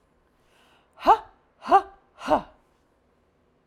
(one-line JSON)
{"exhalation_length": "3.7 s", "exhalation_amplitude": 18275, "exhalation_signal_mean_std_ratio": 0.26, "survey_phase": "alpha (2021-03-01 to 2021-08-12)", "age": "45-64", "gender": "Female", "wearing_mask": "No", "symptom_none": true, "smoker_status": "Never smoked", "respiratory_condition_asthma": false, "respiratory_condition_other": false, "recruitment_source": "REACT", "submission_delay": "2 days", "covid_test_result": "Negative", "covid_test_method": "RT-qPCR"}